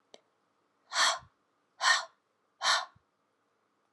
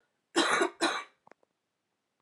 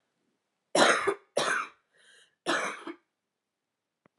{"exhalation_length": "3.9 s", "exhalation_amplitude": 7639, "exhalation_signal_mean_std_ratio": 0.33, "cough_length": "2.2 s", "cough_amplitude": 7656, "cough_signal_mean_std_ratio": 0.4, "three_cough_length": "4.2 s", "three_cough_amplitude": 13543, "three_cough_signal_mean_std_ratio": 0.37, "survey_phase": "alpha (2021-03-01 to 2021-08-12)", "age": "18-44", "gender": "Female", "wearing_mask": "No", "symptom_cough_any": true, "symptom_shortness_of_breath": true, "symptom_fatigue": true, "symptom_headache": true, "smoker_status": "Never smoked", "respiratory_condition_asthma": true, "respiratory_condition_other": false, "recruitment_source": "Test and Trace", "submission_delay": "2 days", "covid_test_result": "Positive", "covid_test_method": "ePCR"}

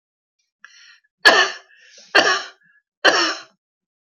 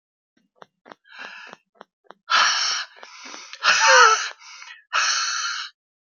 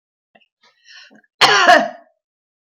{"three_cough_length": "4.0 s", "three_cough_amplitude": 31292, "three_cough_signal_mean_std_ratio": 0.35, "exhalation_length": "6.1 s", "exhalation_amplitude": 27921, "exhalation_signal_mean_std_ratio": 0.44, "cough_length": "2.7 s", "cough_amplitude": 32481, "cough_signal_mean_std_ratio": 0.33, "survey_phase": "beta (2021-08-13 to 2022-03-07)", "age": "65+", "gender": "Female", "wearing_mask": "No", "symptom_none": true, "smoker_status": "Ex-smoker", "respiratory_condition_asthma": false, "respiratory_condition_other": false, "recruitment_source": "REACT", "submission_delay": "-1 day", "covid_test_result": "Negative", "covid_test_method": "RT-qPCR", "influenza_a_test_result": "Unknown/Void", "influenza_b_test_result": "Unknown/Void"}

